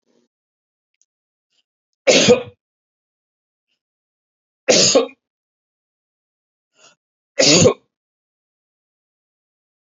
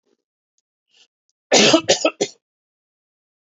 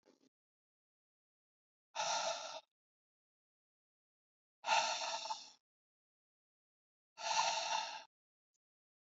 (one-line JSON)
{"three_cough_length": "9.9 s", "three_cough_amplitude": 30983, "three_cough_signal_mean_std_ratio": 0.26, "cough_length": "3.4 s", "cough_amplitude": 32574, "cough_signal_mean_std_ratio": 0.3, "exhalation_length": "9.0 s", "exhalation_amplitude": 3220, "exhalation_signal_mean_std_ratio": 0.37, "survey_phase": "alpha (2021-03-01 to 2021-08-12)", "age": "45-64", "gender": "Male", "wearing_mask": "No", "symptom_none": true, "smoker_status": "Ex-smoker", "respiratory_condition_asthma": false, "respiratory_condition_other": false, "recruitment_source": "REACT", "submission_delay": "1 day", "covid_test_result": "Negative", "covid_test_method": "RT-qPCR"}